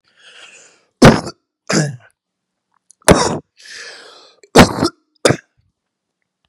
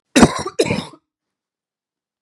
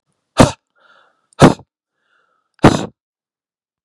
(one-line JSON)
{"three_cough_length": "6.5 s", "three_cough_amplitude": 32768, "three_cough_signal_mean_std_ratio": 0.3, "cough_length": "2.2 s", "cough_amplitude": 32768, "cough_signal_mean_std_ratio": 0.3, "exhalation_length": "3.8 s", "exhalation_amplitude": 32768, "exhalation_signal_mean_std_ratio": 0.24, "survey_phase": "beta (2021-08-13 to 2022-03-07)", "age": "18-44", "gender": "Male", "wearing_mask": "No", "symptom_cough_any": true, "symptom_runny_or_blocked_nose": true, "symptom_fatigue": true, "symptom_onset": "3 days", "smoker_status": "Never smoked", "respiratory_condition_asthma": false, "respiratory_condition_other": false, "recruitment_source": "Test and Trace", "submission_delay": "2 days", "covid_test_result": "Positive", "covid_test_method": "RT-qPCR", "covid_ct_value": 22.4, "covid_ct_gene": "N gene"}